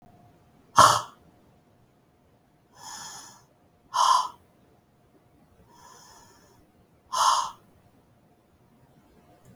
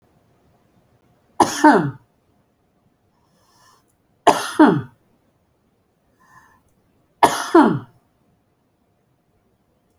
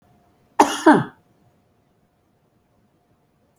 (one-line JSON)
{"exhalation_length": "9.6 s", "exhalation_amplitude": 26248, "exhalation_signal_mean_std_ratio": 0.26, "three_cough_length": "10.0 s", "three_cough_amplitude": 31483, "three_cough_signal_mean_std_ratio": 0.27, "cough_length": "3.6 s", "cough_amplitude": 29187, "cough_signal_mean_std_ratio": 0.22, "survey_phase": "beta (2021-08-13 to 2022-03-07)", "age": "45-64", "gender": "Female", "wearing_mask": "No", "symptom_none": true, "smoker_status": "Never smoked", "respiratory_condition_asthma": true, "respiratory_condition_other": false, "recruitment_source": "REACT", "submission_delay": "1 day", "covid_test_result": "Negative", "covid_test_method": "RT-qPCR"}